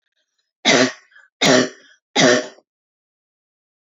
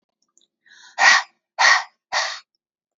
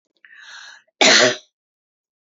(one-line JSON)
{"three_cough_length": "3.9 s", "three_cough_amplitude": 28908, "three_cough_signal_mean_std_ratio": 0.37, "exhalation_length": "3.0 s", "exhalation_amplitude": 28985, "exhalation_signal_mean_std_ratio": 0.36, "cough_length": "2.2 s", "cough_amplitude": 32767, "cough_signal_mean_std_ratio": 0.33, "survey_phase": "alpha (2021-03-01 to 2021-08-12)", "age": "45-64", "gender": "Female", "wearing_mask": "No", "symptom_none": true, "smoker_status": "Ex-smoker", "respiratory_condition_asthma": false, "respiratory_condition_other": false, "recruitment_source": "REACT", "submission_delay": "1 day", "covid_test_result": "Negative", "covid_test_method": "RT-qPCR"}